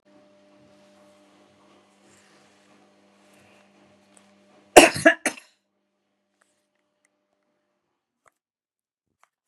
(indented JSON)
{
  "cough_length": "9.5 s",
  "cough_amplitude": 32768,
  "cough_signal_mean_std_ratio": 0.13,
  "survey_phase": "beta (2021-08-13 to 2022-03-07)",
  "age": "65+",
  "gender": "Female",
  "wearing_mask": "No",
  "symptom_none": true,
  "smoker_status": "Ex-smoker",
  "respiratory_condition_asthma": false,
  "respiratory_condition_other": false,
  "recruitment_source": "REACT",
  "submission_delay": "1 day",
  "covid_test_result": "Negative",
  "covid_test_method": "RT-qPCR",
  "influenza_a_test_result": "Negative",
  "influenza_b_test_result": "Negative"
}